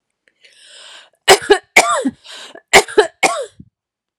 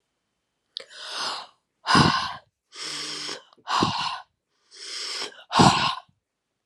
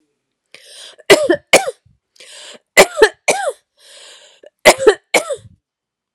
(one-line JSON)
{"cough_length": "4.2 s", "cough_amplitude": 32768, "cough_signal_mean_std_ratio": 0.35, "exhalation_length": "6.7 s", "exhalation_amplitude": 27627, "exhalation_signal_mean_std_ratio": 0.43, "three_cough_length": "6.1 s", "three_cough_amplitude": 32768, "three_cough_signal_mean_std_ratio": 0.33, "survey_phase": "alpha (2021-03-01 to 2021-08-12)", "age": "45-64", "gender": "Female", "wearing_mask": "No", "symptom_none": true, "smoker_status": "Never smoked", "respiratory_condition_asthma": false, "respiratory_condition_other": false, "recruitment_source": "REACT", "submission_delay": "1 day", "covid_test_method": "RT-qPCR"}